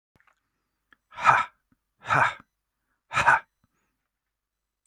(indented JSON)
{
  "exhalation_length": "4.9 s",
  "exhalation_amplitude": 25087,
  "exhalation_signal_mean_std_ratio": 0.29,
  "survey_phase": "beta (2021-08-13 to 2022-03-07)",
  "age": "45-64",
  "gender": "Male",
  "wearing_mask": "No",
  "symptom_none": true,
  "smoker_status": "Never smoked",
  "respiratory_condition_asthma": false,
  "respiratory_condition_other": false,
  "recruitment_source": "REACT",
  "submission_delay": "3 days",
  "covid_test_result": "Negative",
  "covid_test_method": "RT-qPCR",
  "influenza_a_test_result": "Negative",
  "influenza_b_test_result": "Negative"
}